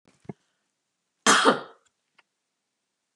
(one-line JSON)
{"cough_length": "3.2 s", "cough_amplitude": 18322, "cough_signal_mean_std_ratio": 0.25, "survey_phase": "beta (2021-08-13 to 2022-03-07)", "age": "65+", "gender": "Female", "wearing_mask": "No", "symptom_sore_throat": true, "smoker_status": "Never smoked", "respiratory_condition_asthma": false, "respiratory_condition_other": false, "recruitment_source": "REACT", "submission_delay": "2 days", "covid_test_result": "Negative", "covid_test_method": "RT-qPCR", "influenza_a_test_result": "Negative", "influenza_b_test_result": "Negative"}